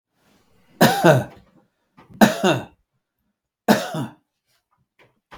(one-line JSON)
{"three_cough_length": "5.4 s", "three_cough_amplitude": 32766, "three_cough_signal_mean_std_ratio": 0.32, "survey_phase": "beta (2021-08-13 to 2022-03-07)", "age": "65+", "gender": "Male", "wearing_mask": "No", "symptom_none": true, "smoker_status": "Never smoked", "respiratory_condition_asthma": false, "respiratory_condition_other": false, "recruitment_source": "REACT", "submission_delay": "0 days", "covid_test_result": "Negative", "covid_test_method": "RT-qPCR"}